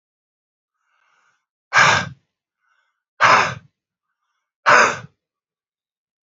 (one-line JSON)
{"exhalation_length": "6.2 s", "exhalation_amplitude": 28369, "exhalation_signal_mean_std_ratio": 0.3, "survey_phase": "beta (2021-08-13 to 2022-03-07)", "age": "18-44", "gender": "Male", "wearing_mask": "Yes", "symptom_cough_any": true, "symptom_headache": true, "symptom_change_to_sense_of_smell_or_taste": true, "symptom_other": true, "symptom_onset": "3 days", "smoker_status": "Current smoker (1 to 10 cigarettes per day)", "respiratory_condition_asthma": false, "respiratory_condition_other": false, "recruitment_source": "Test and Trace", "submission_delay": "1 day", "covid_test_result": "Positive", "covid_test_method": "RT-qPCR", "covid_ct_value": 18.1, "covid_ct_gene": "ORF1ab gene", "covid_ct_mean": 18.4, "covid_viral_load": "930000 copies/ml", "covid_viral_load_category": "Low viral load (10K-1M copies/ml)"}